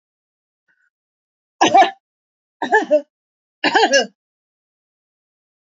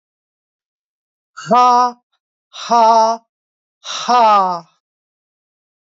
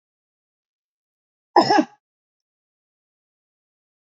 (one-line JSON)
{"three_cough_length": "5.6 s", "three_cough_amplitude": 29220, "three_cough_signal_mean_std_ratio": 0.31, "exhalation_length": "6.0 s", "exhalation_amplitude": 28453, "exhalation_signal_mean_std_ratio": 0.42, "cough_length": "4.2 s", "cough_amplitude": 30719, "cough_signal_mean_std_ratio": 0.19, "survey_phase": "alpha (2021-03-01 to 2021-08-12)", "age": "45-64", "gender": "Female", "wearing_mask": "No", "symptom_none": true, "symptom_fatigue": true, "smoker_status": "Never smoked", "respiratory_condition_asthma": false, "respiratory_condition_other": false, "recruitment_source": "REACT", "submission_delay": "8 days", "covid_test_result": "Negative", "covid_test_method": "RT-qPCR"}